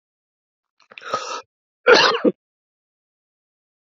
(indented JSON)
{
  "cough_length": "3.8 s",
  "cough_amplitude": 32221,
  "cough_signal_mean_std_ratio": 0.28,
  "survey_phase": "alpha (2021-03-01 to 2021-08-12)",
  "age": "18-44",
  "gender": "Male",
  "wearing_mask": "No",
  "symptom_cough_any": true,
  "symptom_fatigue": true,
  "symptom_headache": true,
  "symptom_change_to_sense_of_smell_or_taste": true,
  "symptom_onset": "4 days",
  "smoker_status": "Never smoked",
  "respiratory_condition_asthma": false,
  "respiratory_condition_other": false,
  "recruitment_source": "Test and Trace",
  "submission_delay": "2 days",
  "covid_test_result": "Positive",
  "covid_test_method": "RT-qPCR",
  "covid_ct_value": 17.7,
  "covid_ct_gene": "S gene",
  "covid_ct_mean": 18.1,
  "covid_viral_load": "1100000 copies/ml",
  "covid_viral_load_category": "High viral load (>1M copies/ml)"
}